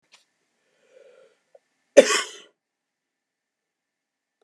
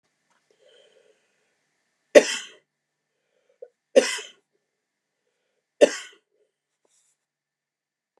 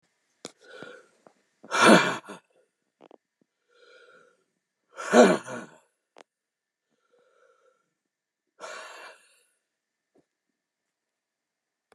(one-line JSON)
{"cough_length": "4.4 s", "cough_amplitude": 32768, "cough_signal_mean_std_ratio": 0.15, "three_cough_length": "8.2 s", "three_cough_amplitude": 32768, "three_cough_signal_mean_std_ratio": 0.15, "exhalation_length": "11.9 s", "exhalation_amplitude": 24979, "exhalation_signal_mean_std_ratio": 0.2, "survey_phase": "beta (2021-08-13 to 2022-03-07)", "age": "65+", "gender": "Male", "wearing_mask": "No", "symptom_none": true, "smoker_status": "Ex-smoker", "respiratory_condition_asthma": true, "respiratory_condition_other": false, "recruitment_source": "REACT", "submission_delay": "2 days", "covid_test_result": "Negative", "covid_test_method": "RT-qPCR", "influenza_a_test_result": "Negative", "influenza_b_test_result": "Negative"}